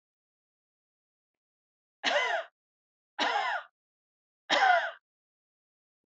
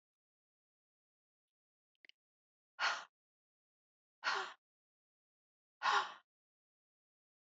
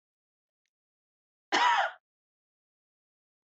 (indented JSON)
{
  "three_cough_length": "6.1 s",
  "three_cough_amplitude": 7362,
  "three_cough_signal_mean_std_ratio": 0.35,
  "exhalation_length": "7.4 s",
  "exhalation_amplitude": 2496,
  "exhalation_signal_mean_std_ratio": 0.24,
  "cough_length": "3.5 s",
  "cough_amplitude": 8544,
  "cough_signal_mean_std_ratio": 0.27,
  "survey_phase": "alpha (2021-03-01 to 2021-08-12)",
  "age": "65+",
  "gender": "Female",
  "wearing_mask": "No",
  "symptom_none": true,
  "smoker_status": "Never smoked",
  "respiratory_condition_asthma": false,
  "respiratory_condition_other": false,
  "recruitment_source": "REACT",
  "submission_delay": "2 days",
  "covid_test_result": "Negative",
  "covid_test_method": "RT-qPCR"
}